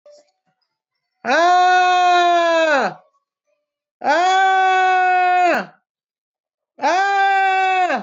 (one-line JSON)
{"exhalation_length": "8.0 s", "exhalation_amplitude": 17789, "exhalation_signal_mean_std_ratio": 0.76, "survey_phase": "beta (2021-08-13 to 2022-03-07)", "age": "18-44", "gender": "Male", "wearing_mask": "No", "symptom_cough_any": true, "symptom_diarrhoea": true, "symptom_fatigue": true, "symptom_headache": true, "smoker_status": "Never smoked", "respiratory_condition_asthma": false, "respiratory_condition_other": false, "recruitment_source": "Test and Trace", "submission_delay": "2 days", "covid_test_result": "Positive", "covid_test_method": "ePCR"}